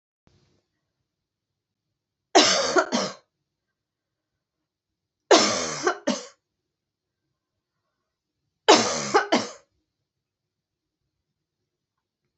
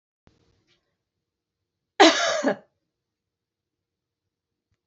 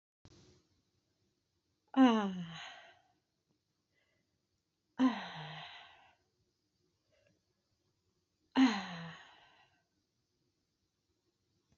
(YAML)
three_cough_length: 12.4 s
three_cough_amplitude: 27665
three_cough_signal_mean_std_ratio: 0.28
cough_length: 4.9 s
cough_amplitude: 27544
cough_signal_mean_std_ratio: 0.22
exhalation_length: 11.8 s
exhalation_amplitude: 6301
exhalation_signal_mean_std_ratio: 0.24
survey_phase: beta (2021-08-13 to 2022-03-07)
age: 45-64
gender: Female
wearing_mask: 'No'
symptom_new_continuous_cough: true
symptom_runny_or_blocked_nose: true
symptom_fatigue: true
symptom_onset: 5 days
smoker_status: Never smoked
respiratory_condition_asthma: false
respiratory_condition_other: false
recruitment_source: Test and Trace
submission_delay: 1 day
covid_test_result: Positive
covid_test_method: RT-qPCR
covid_ct_value: 10.3
covid_ct_gene: S gene